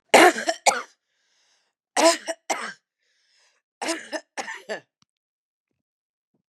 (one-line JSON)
{"three_cough_length": "6.5 s", "three_cough_amplitude": 32004, "three_cough_signal_mean_std_ratio": 0.28, "survey_phase": "beta (2021-08-13 to 2022-03-07)", "age": "45-64", "gender": "Female", "wearing_mask": "No", "symptom_cough_any": true, "symptom_runny_or_blocked_nose": true, "symptom_sore_throat": true, "symptom_onset": "1 day", "smoker_status": "Ex-smoker", "respiratory_condition_asthma": false, "respiratory_condition_other": false, "recruitment_source": "Test and Trace", "submission_delay": "1 day", "covid_test_result": "Positive", "covid_test_method": "LAMP"}